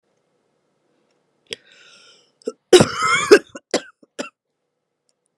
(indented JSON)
{
  "cough_length": "5.4 s",
  "cough_amplitude": 32768,
  "cough_signal_mean_std_ratio": 0.24,
  "survey_phase": "beta (2021-08-13 to 2022-03-07)",
  "age": "18-44",
  "gender": "Female",
  "wearing_mask": "No",
  "symptom_cough_any": true,
  "symptom_runny_or_blocked_nose": true,
  "symptom_onset": "7 days",
  "smoker_status": "Ex-smoker",
  "respiratory_condition_asthma": false,
  "respiratory_condition_other": false,
  "recruitment_source": "REACT",
  "submission_delay": "1 day",
  "covid_test_result": "Negative",
  "covid_test_method": "RT-qPCR",
  "influenza_a_test_result": "Negative",
  "influenza_b_test_result": "Negative"
}